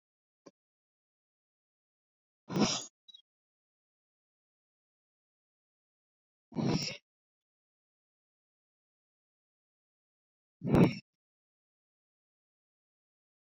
{"exhalation_length": "13.5 s", "exhalation_amplitude": 8721, "exhalation_signal_mean_std_ratio": 0.19, "survey_phase": "beta (2021-08-13 to 2022-03-07)", "age": "18-44", "gender": "Male", "wearing_mask": "No", "symptom_cough_any": true, "symptom_runny_or_blocked_nose": true, "symptom_shortness_of_breath": true, "symptom_sore_throat": true, "symptom_fatigue": true, "symptom_fever_high_temperature": true, "symptom_headache": true, "symptom_onset": "3 days", "smoker_status": "Current smoker (e-cigarettes or vapes only)", "respiratory_condition_asthma": false, "respiratory_condition_other": false, "recruitment_source": "Test and Trace", "submission_delay": "2 days", "covid_test_result": "Positive", "covid_test_method": "LAMP"}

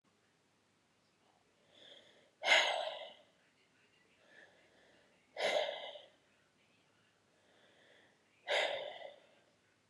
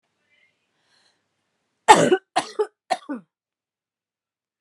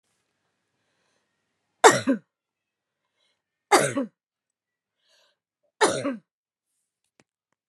{"exhalation_length": "9.9 s", "exhalation_amplitude": 5283, "exhalation_signal_mean_std_ratio": 0.31, "cough_length": "4.6 s", "cough_amplitude": 32768, "cough_signal_mean_std_ratio": 0.23, "three_cough_length": "7.7 s", "three_cough_amplitude": 29658, "three_cough_signal_mean_std_ratio": 0.22, "survey_phase": "beta (2021-08-13 to 2022-03-07)", "age": "45-64", "gender": "Female", "wearing_mask": "No", "symptom_cough_any": true, "symptom_runny_or_blocked_nose": true, "symptom_sore_throat": true, "symptom_fatigue": true, "symptom_headache": true, "symptom_change_to_sense_of_smell_or_taste": true, "smoker_status": "Ex-smoker", "respiratory_condition_asthma": false, "respiratory_condition_other": false, "recruitment_source": "Test and Trace", "submission_delay": "3 days", "covid_test_result": "Positive", "covid_test_method": "RT-qPCR", "covid_ct_value": 17.8, "covid_ct_gene": "ORF1ab gene", "covid_ct_mean": 18.4, "covid_viral_load": "940000 copies/ml", "covid_viral_load_category": "Low viral load (10K-1M copies/ml)"}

